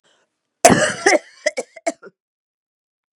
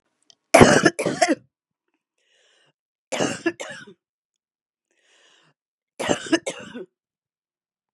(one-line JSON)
{"cough_length": "3.2 s", "cough_amplitude": 32768, "cough_signal_mean_std_ratio": 0.31, "three_cough_length": "7.9 s", "three_cough_amplitude": 32767, "three_cough_signal_mean_std_ratio": 0.27, "survey_phase": "beta (2021-08-13 to 2022-03-07)", "age": "65+", "gender": "Female", "wearing_mask": "No", "symptom_cough_any": true, "symptom_runny_or_blocked_nose": true, "symptom_onset": "3 days", "smoker_status": "Ex-smoker", "respiratory_condition_asthma": false, "respiratory_condition_other": false, "recruitment_source": "Test and Trace", "submission_delay": "1 day", "covid_test_result": "Positive", "covid_test_method": "ePCR"}